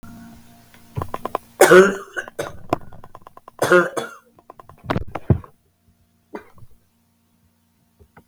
{"cough_length": "8.3 s", "cough_amplitude": 32766, "cough_signal_mean_std_ratio": 0.3, "survey_phase": "beta (2021-08-13 to 2022-03-07)", "age": "45-64", "gender": "Female", "wearing_mask": "No", "symptom_cough_any": true, "symptom_runny_or_blocked_nose": true, "symptom_sore_throat": true, "symptom_headache": true, "symptom_change_to_sense_of_smell_or_taste": true, "symptom_loss_of_taste": true, "symptom_onset": "6 days", "smoker_status": "Never smoked", "respiratory_condition_asthma": false, "respiratory_condition_other": false, "recruitment_source": "Test and Trace", "submission_delay": "2 days", "covid_test_result": "Positive", "covid_test_method": "RT-qPCR", "covid_ct_value": 12.5, "covid_ct_gene": "ORF1ab gene", "covid_ct_mean": 12.9, "covid_viral_load": "60000000 copies/ml", "covid_viral_load_category": "High viral load (>1M copies/ml)"}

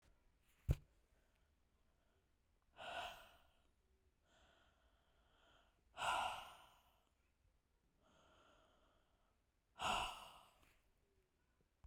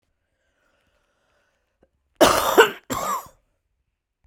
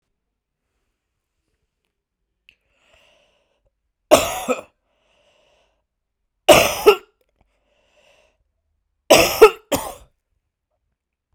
{"exhalation_length": "11.9 s", "exhalation_amplitude": 2239, "exhalation_signal_mean_std_ratio": 0.28, "cough_length": "4.3 s", "cough_amplitude": 32768, "cough_signal_mean_std_ratio": 0.28, "three_cough_length": "11.3 s", "three_cough_amplitude": 32768, "three_cough_signal_mean_std_ratio": 0.22, "survey_phase": "beta (2021-08-13 to 2022-03-07)", "age": "45-64", "gender": "Female", "wearing_mask": "No", "symptom_cough_any": true, "symptom_runny_or_blocked_nose": true, "symptom_sore_throat": true, "symptom_abdominal_pain": true, "symptom_fever_high_temperature": true, "symptom_change_to_sense_of_smell_or_taste": true, "symptom_loss_of_taste": true, "symptom_onset": "3 days", "smoker_status": "Current smoker (1 to 10 cigarettes per day)", "respiratory_condition_asthma": false, "respiratory_condition_other": false, "recruitment_source": "Test and Trace", "submission_delay": "2 days", "covid_test_result": "Positive", "covid_test_method": "RT-qPCR"}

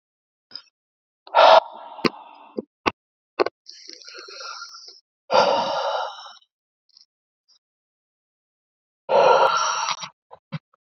{"exhalation_length": "10.8 s", "exhalation_amplitude": 29987, "exhalation_signal_mean_std_ratio": 0.34, "survey_phase": "beta (2021-08-13 to 2022-03-07)", "age": "45-64", "gender": "Male", "wearing_mask": "No", "symptom_none": true, "smoker_status": "Never smoked", "respiratory_condition_asthma": false, "respiratory_condition_other": false, "recruitment_source": "REACT", "submission_delay": "1 day", "covid_test_result": "Negative", "covid_test_method": "RT-qPCR", "influenza_a_test_result": "Negative", "influenza_b_test_result": "Negative"}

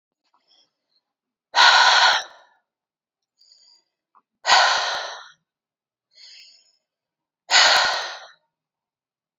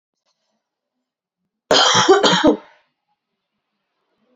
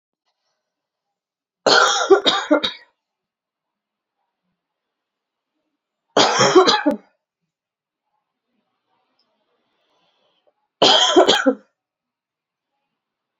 {"exhalation_length": "9.4 s", "exhalation_amplitude": 27231, "exhalation_signal_mean_std_ratio": 0.35, "cough_length": "4.4 s", "cough_amplitude": 32767, "cough_signal_mean_std_ratio": 0.35, "three_cough_length": "13.4 s", "three_cough_amplitude": 32768, "three_cough_signal_mean_std_ratio": 0.32, "survey_phase": "beta (2021-08-13 to 2022-03-07)", "age": "18-44", "gender": "Female", "wearing_mask": "No", "symptom_cough_any": true, "symptom_runny_or_blocked_nose": true, "symptom_sore_throat": true, "symptom_diarrhoea": true, "symptom_onset": "4 days", "smoker_status": "Never smoked", "respiratory_condition_asthma": false, "respiratory_condition_other": false, "recruitment_source": "Test and Trace", "submission_delay": "2 days", "covid_test_result": "Positive", "covid_test_method": "RT-qPCR", "covid_ct_value": 14.1, "covid_ct_gene": "ORF1ab gene"}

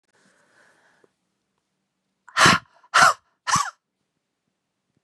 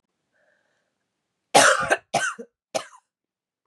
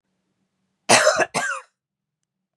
{"exhalation_length": "5.0 s", "exhalation_amplitude": 28133, "exhalation_signal_mean_std_ratio": 0.26, "three_cough_length": "3.7 s", "three_cough_amplitude": 26425, "three_cough_signal_mean_std_ratio": 0.3, "cough_length": "2.6 s", "cough_amplitude": 32491, "cough_signal_mean_std_ratio": 0.35, "survey_phase": "beta (2021-08-13 to 2022-03-07)", "age": "18-44", "gender": "Female", "wearing_mask": "No", "symptom_cough_any": true, "symptom_runny_or_blocked_nose": true, "symptom_fatigue": true, "symptom_other": true, "smoker_status": "Never smoked", "respiratory_condition_asthma": false, "respiratory_condition_other": false, "recruitment_source": "Test and Trace", "submission_delay": "2 days", "covid_test_result": "Positive", "covid_test_method": "LFT"}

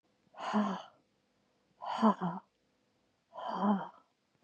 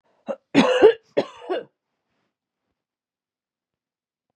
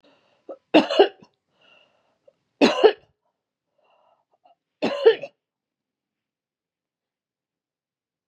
{"exhalation_length": "4.4 s", "exhalation_amplitude": 6877, "exhalation_signal_mean_std_ratio": 0.41, "cough_length": "4.4 s", "cough_amplitude": 27534, "cough_signal_mean_std_ratio": 0.27, "three_cough_length": "8.3 s", "three_cough_amplitude": 29937, "three_cough_signal_mean_std_ratio": 0.23, "survey_phase": "beta (2021-08-13 to 2022-03-07)", "age": "45-64", "gender": "Female", "wearing_mask": "No", "symptom_none": true, "smoker_status": "Never smoked", "respiratory_condition_asthma": false, "respiratory_condition_other": false, "recruitment_source": "REACT", "submission_delay": "2 days", "covid_test_result": "Negative", "covid_test_method": "RT-qPCR", "influenza_a_test_result": "Negative", "influenza_b_test_result": "Negative"}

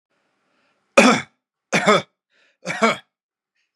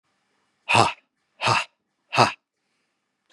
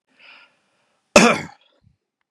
{"three_cough_length": "3.8 s", "three_cough_amplitude": 32767, "three_cough_signal_mean_std_ratio": 0.32, "exhalation_length": "3.3 s", "exhalation_amplitude": 31045, "exhalation_signal_mean_std_ratio": 0.32, "cough_length": "2.3 s", "cough_amplitude": 32768, "cough_signal_mean_std_ratio": 0.24, "survey_phase": "beta (2021-08-13 to 2022-03-07)", "age": "18-44", "gender": "Male", "wearing_mask": "No", "symptom_none": true, "smoker_status": "Never smoked", "respiratory_condition_asthma": false, "respiratory_condition_other": false, "recruitment_source": "REACT", "submission_delay": "2 days", "covid_test_result": "Negative", "covid_test_method": "RT-qPCR", "influenza_a_test_result": "Negative", "influenza_b_test_result": "Negative"}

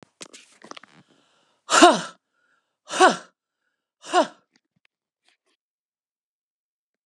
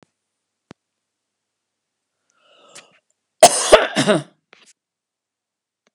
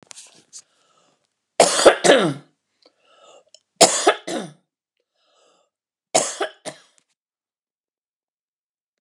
{"exhalation_length": "7.1 s", "exhalation_amplitude": 32746, "exhalation_signal_mean_std_ratio": 0.22, "cough_length": "5.9 s", "cough_amplitude": 32768, "cough_signal_mean_std_ratio": 0.21, "three_cough_length": "9.0 s", "three_cough_amplitude": 32768, "three_cough_signal_mean_std_ratio": 0.27, "survey_phase": "beta (2021-08-13 to 2022-03-07)", "age": "45-64", "gender": "Female", "wearing_mask": "No", "symptom_none": true, "smoker_status": "Ex-smoker", "respiratory_condition_asthma": false, "respiratory_condition_other": false, "recruitment_source": "REACT", "submission_delay": "1 day", "covid_test_result": "Negative", "covid_test_method": "RT-qPCR"}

